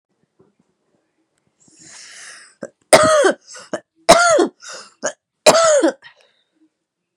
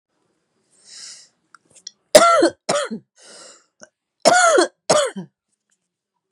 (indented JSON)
{
  "three_cough_length": "7.2 s",
  "three_cough_amplitude": 32768,
  "three_cough_signal_mean_std_ratio": 0.37,
  "cough_length": "6.3 s",
  "cough_amplitude": 32768,
  "cough_signal_mean_std_ratio": 0.35,
  "survey_phase": "beta (2021-08-13 to 2022-03-07)",
  "age": "45-64",
  "gender": "Female",
  "wearing_mask": "No",
  "symptom_cough_any": true,
  "symptom_runny_or_blocked_nose": true,
  "symptom_sore_throat": true,
  "symptom_fatigue": true,
  "symptom_change_to_sense_of_smell_or_taste": true,
  "symptom_loss_of_taste": true,
  "symptom_onset": "0 days",
  "smoker_status": "Current smoker (e-cigarettes or vapes only)",
  "respiratory_condition_asthma": true,
  "respiratory_condition_other": false,
  "recruitment_source": "Test and Trace",
  "submission_delay": "0 days",
  "covid_test_result": "Negative",
  "covid_test_method": "RT-qPCR"
}